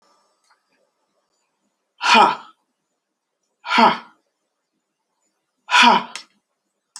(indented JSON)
{
  "exhalation_length": "7.0 s",
  "exhalation_amplitude": 32768,
  "exhalation_signal_mean_std_ratio": 0.29,
  "survey_phase": "alpha (2021-03-01 to 2021-08-12)",
  "age": "65+",
  "gender": "Female",
  "wearing_mask": "No",
  "symptom_none": true,
  "smoker_status": "Never smoked",
  "respiratory_condition_asthma": false,
  "respiratory_condition_other": false,
  "recruitment_source": "REACT",
  "submission_delay": "2 days",
  "covid_test_result": "Negative",
  "covid_test_method": "RT-qPCR"
}